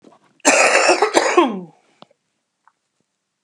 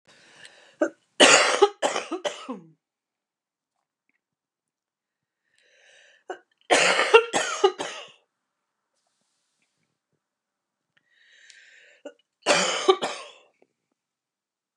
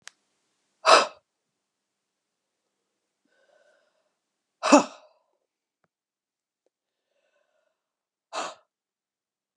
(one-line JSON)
{"cough_length": "3.4 s", "cough_amplitude": 32768, "cough_signal_mean_std_ratio": 0.45, "three_cough_length": "14.8 s", "three_cough_amplitude": 30810, "three_cough_signal_mean_std_ratio": 0.29, "exhalation_length": "9.6 s", "exhalation_amplitude": 28924, "exhalation_signal_mean_std_ratio": 0.16, "survey_phase": "beta (2021-08-13 to 2022-03-07)", "age": "45-64", "gender": "Female", "wearing_mask": "No", "symptom_cough_any": true, "symptom_runny_or_blocked_nose": true, "symptom_headache": true, "symptom_onset": "9 days", "smoker_status": "Ex-smoker", "respiratory_condition_asthma": true, "respiratory_condition_other": false, "recruitment_source": "REACT", "submission_delay": "0 days", "covid_test_result": "Negative", "covid_test_method": "RT-qPCR"}